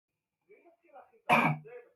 {"cough_length": "2.0 s", "cough_amplitude": 9103, "cough_signal_mean_std_ratio": 0.33, "survey_phase": "beta (2021-08-13 to 2022-03-07)", "age": "45-64", "gender": "Male", "wearing_mask": "No", "symptom_none": true, "smoker_status": "Current smoker (e-cigarettes or vapes only)", "respiratory_condition_asthma": false, "respiratory_condition_other": false, "recruitment_source": "REACT", "submission_delay": "10 days", "covid_test_result": "Negative", "covid_test_method": "RT-qPCR", "influenza_a_test_result": "Unknown/Void", "influenza_b_test_result": "Unknown/Void"}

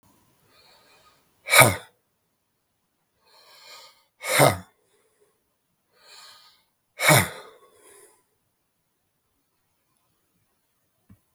{"exhalation_length": "11.3 s", "exhalation_amplitude": 32766, "exhalation_signal_mean_std_ratio": 0.21, "survey_phase": "beta (2021-08-13 to 2022-03-07)", "age": "45-64", "gender": "Male", "wearing_mask": "No", "symptom_cough_any": true, "symptom_runny_or_blocked_nose": true, "symptom_sore_throat": true, "symptom_headache": true, "smoker_status": "Never smoked", "respiratory_condition_asthma": false, "respiratory_condition_other": false, "recruitment_source": "Test and Trace", "submission_delay": "1 day", "covid_test_result": "Positive", "covid_test_method": "ePCR"}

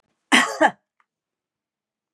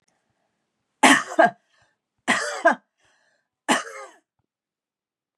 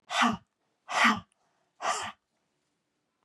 {"cough_length": "2.1 s", "cough_amplitude": 30503, "cough_signal_mean_std_ratio": 0.28, "three_cough_length": "5.4 s", "three_cough_amplitude": 27968, "three_cough_signal_mean_std_ratio": 0.29, "exhalation_length": "3.2 s", "exhalation_amplitude": 9369, "exhalation_signal_mean_std_ratio": 0.37, "survey_phase": "beta (2021-08-13 to 2022-03-07)", "age": "45-64", "gender": "Female", "wearing_mask": "No", "symptom_change_to_sense_of_smell_or_taste": true, "smoker_status": "Never smoked", "respiratory_condition_asthma": false, "respiratory_condition_other": false, "recruitment_source": "Test and Trace", "submission_delay": "2 days", "covid_test_result": "Positive", "covid_test_method": "RT-qPCR", "covid_ct_value": 24.6, "covid_ct_gene": "ORF1ab gene", "covid_ct_mean": 25.6, "covid_viral_load": "4100 copies/ml", "covid_viral_load_category": "Minimal viral load (< 10K copies/ml)"}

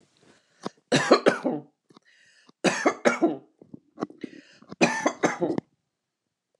{"three_cough_length": "6.6 s", "three_cough_amplitude": 24884, "three_cough_signal_mean_std_ratio": 0.37, "survey_phase": "alpha (2021-03-01 to 2021-08-12)", "age": "45-64", "gender": "Female", "wearing_mask": "No", "symptom_none": true, "smoker_status": "Current smoker (11 or more cigarettes per day)", "respiratory_condition_asthma": false, "respiratory_condition_other": false, "recruitment_source": "REACT", "submission_delay": "1 day", "covid_test_result": "Negative", "covid_test_method": "RT-qPCR"}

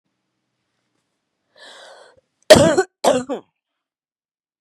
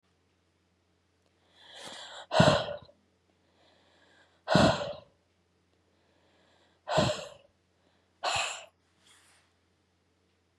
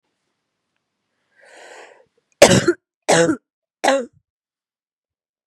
{"cough_length": "4.6 s", "cough_amplitude": 32768, "cough_signal_mean_std_ratio": 0.25, "exhalation_length": "10.6 s", "exhalation_amplitude": 14963, "exhalation_signal_mean_std_ratio": 0.29, "three_cough_length": "5.5 s", "three_cough_amplitude": 32768, "three_cough_signal_mean_std_ratio": 0.28, "survey_phase": "beta (2021-08-13 to 2022-03-07)", "age": "18-44", "gender": "Female", "wearing_mask": "No", "symptom_cough_any": true, "symptom_runny_or_blocked_nose": true, "symptom_sore_throat": true, "symptom_abdominal_pain": true, "symptom_headache": true, "symptom_onset": "3 days", "smoker_status": "Never smoked", "respiratory_condition_asthma": false, "respiratory_condition_other": false, "recruitment_source": "Test and Trace", "submission_delay": "1 day", "covid_test_result": "Positive", "covid_test_method": "RT-qPCR", "covid_ct_value": 14.3, "covid_ct_gene": "N gene", "covid_ct_mean": 14.4, "covid_viral_load": "19000000 copies/ml", "covid_viral_load_category": "High viral load (>1M copies/ml)"}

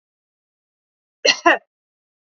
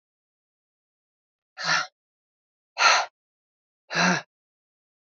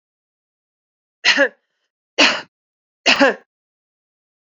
{"cough_length": "2.4 s", "cough_amplitude": 30816, "cough_signal_mean_std_ratio": 0.23, "exhalation_length": "5.0 s", "exhalation_amplitude": 16871, "exhalation_signal_mean_std_ratio": 0.3, "three_cough_length": "4.4 s", "three_cough_amplitude": 31625, "three_cough_signal_mean_std_ratio": 0.3, "survey_phase": "beta (2021-08-13 to 2022-03-07)", "age": "45-64", "gender": "Female", "wearing_mask": "No", "symptom_runny_or_blocked_nose": true, "symptom_fatigue": true, "symptom_headache": true, "symptom_change_to_sense_of_smell_or_taste": true, "smoker_status": "Ex-smoker", "respiratory_condition_asthma": false, "respiratory_condition_other": false, "recruitment_source": "Test and Trace", "submission_delay": "1 day", "covid_test_result": "Positive", "covid_test_method": "RT-qPCR"}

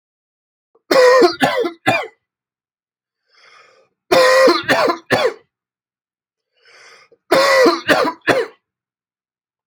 {"three_cough_length": "9.7 s", "three_cough_amplitude": 32767, "three_cough_signal_mean_std_ratio": 0.45, "survey_phase": "alpha (2021-03-01 to 2021-08-12)", "age": "18-44", "gender": "Male", "wearing_mask": "No", "symptom_cough_any": true, "smoker_status": "Ex-smoker", "respiratory_condition_asthma": false, "respiratory_condition_other": false, "recruitment_source": "REACT", "submission_delay": "2 days", "covid_test_result": "Negative", "covid_test_method": "RT-qPCR"}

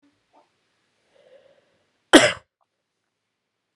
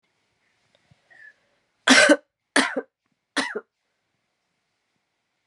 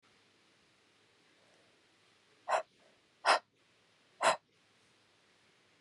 {"cough_length": "3.8 s", "cough_amplitude": 32767, "cough_signal_mean_std_ratio": 0.16, "three_cough_length": "5.5 s", "three_cough_amplitude": 30706, "three_cough_signal_mean_std_ratio": 0.25, "exhalation_length": "5.8 s", "exhalation_amplitude": 6620, "exhalation_signal_mean_std_ratio": 0.22, "survey_phase": "beta (2021-08-13 to 2022-03-07)", "age": "18-44", "gender": "Female", "wearing_mask": "No", "symptom_cough_any": true, "symptom_new_continuous_cough": true, "symptom_runny_or_blocked_nose": true, "symptom_sore_throat": true, "symptom_onset": "4 days", "smoker_status": "Never smoked", "respiratory_condition_asthma": false, "respiratory_condition_other": false, "recruitment_source": "Test and Trace", "submission_delay": "2 days", "covid_test_result": "Positive", "covid_test_method": "RT-qPCR", "covid_ct_value": 17.6, "covid_ct_gene": "ORF1ab gene", "covid_ct_mean": 18.0, "covid_viral_load": "1200000 copies/ml", "covid_viral_load_category": "High viral load (>1M copies/ml)"}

